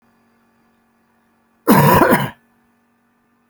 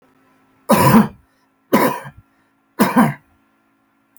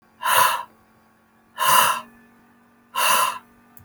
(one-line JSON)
{"cough_length": "3.5 s", "cough_amplitude": 32306, "cough_signal_mean_std_ratio": 0.34, "three_cough_length": "4.2 s", "three_cough_amplitude": 32034, "three_cough_signal_mean_std_ratio": 0.38, "exhalation_length": "3.8 s", "exhalation_amplitude": 25474, "exhalation_signal_mean_std_ratio": 0.47, "survey_phase": "alpha (2021-03-01 to 2021-08-12)", "age": "45-64", "gender": "Male", "wearing_mask": "No", "symptom_none": true, "smoker_status": "Never smoked", "respiratory_condition_asthma": false, "respiratory_condition_other": false, "recruitment_source": "REACT", "submission_delay": "3 days", "covid_test_result": "Negative", "covid_test_method": "RT-qPCR"}